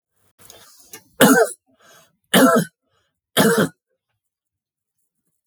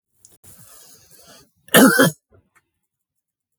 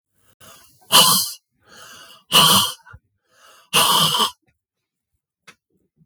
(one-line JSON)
{"three_cough_length": "5.5 s", "three_cough_amplitude": 32768, "three_cough_signal_mean_std_ratio": 0.34, "cough_length": "3.6 s", "cough_amplitude": 32768, "cough_signal_mean_std_ratio": 0.27, "exhalation_length": "6.1 s", "exhalation_amplitude": 32768, "exhalation_signal_mean_std_ratio": 0.38, "survey_phase": "beta (2021-08-13 to 2022-03-07)", "age": "45-64", "gender": "Male", "wearing_mask": "No", "symptom_none": true, "smoker_status": "Ex-smoker", "respiratory_condition_asthma": false, "respiratory_condition_other": false, "recruitment_source": "REACT", "submission_delay": "1 day", "covid_test_result": "Negative", "covid_test_method": "RT-qPCR", "influenza_a_test_result": "Negative", "influenza_b_test_result": "Negative"}